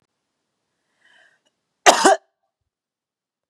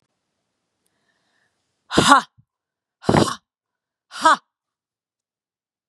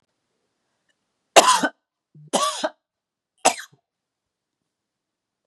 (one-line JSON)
{"cough_length": "3.5 s", "cough_amplitude": 32768, "cough_signal_mean_std_ratio": 0.21, "exhalation_length": "5.9 s", "exhalation_amplitude": 32768, "exhalation_signal_mean_std_ratio": 0.24, "three_cough_length": "5.5 s", "three_cough_amplitude": 32768, "three_cough_signal_mean_std_ratio": 0.24, "survey_phase": "beta (2021-08-13 to 2022-03-07)", "age": "45-64", "gender": "Female", "wearing_mask": "No", "symptom_cough_any": true, "symptom_runny_or_blocked_nose": true, "symptom_fatigue": true, "symptom_change_to_sense_of_smell_or_taste": true, "symptom_onset": "3 days", "smoker_status": "Ex-smoker", "respiratory_condition_asthma": false, "respiratory_condition_other": false, "recruitment_source": "Test and Trace", "submission_delay": "2 days", "covid_test_result": "Positive", "covid_test_method": "RT-qPCR"}